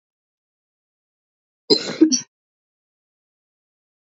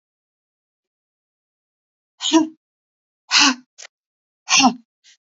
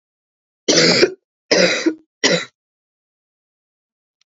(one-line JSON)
{"cough_length": "4.1 s", "cough_amplitude": 30078, "cough_signal_mean_std_ratio": 0.21, "exhalation_length": "5.4 s", "exhalation_amplitude": 31232, "exhalation_signal_mean_std_ratio": 0.28, "three_cough_length": "4.3 s", "three_cough_amplitude": 32767, "three_cough_signal_mean_std_ratio": 0.39, "survey_phase": "alpha (2021-03-01 to 2021-08-12)", "age": "18-44", "gender": "Female", "wearing_mask": "No", "symptom_cough_any": true, "symptom_new_continuous_cough": true, "symptom_shortness_of_breath": true, "symptom_fatigue": true, "symptom_headache": true, "symptom_onset": "5 days", "smoker_status": "Never smoked", "respiratory_condition_asthma": false, "respiratory_condition_other": false, "recruitment_source": "Test and Trace", "submission_delay": "2 days", "covid_test_result": "Positive", "covid_test_method": "RT-qPCR"}